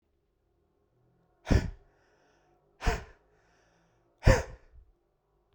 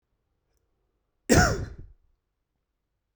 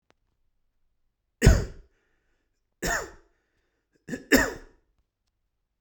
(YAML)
exhalation_length: 5.5 s
exhalation_amplitude: 15018
exhalation_signal_mean_std_ratio: 0.22
cough_length: 3.2 s
cough_amplitude: 18094
cough_signal_mean_std_ratio: 0.25
three_cough_length: 5.8 s
three_cough_amplitude: 22704
three_cough_signal_mean_std_ratio: 0.24
survey_phase: beta (2021-08-13 to 2022-03-07)
age: 18-44
gender: Male
wearing_mask: 'No'
symptom_abdominal_pain: true
symptom_other: true
symptom_onset: 5 days
smoker_status: Never smoked
respiratory_condition_asthma: false
respiratory_condition_other: false
recruitment_source: REACT
submission_delay: 2 days
covid_test_result: Negative
covid_test_method: RT-qPCR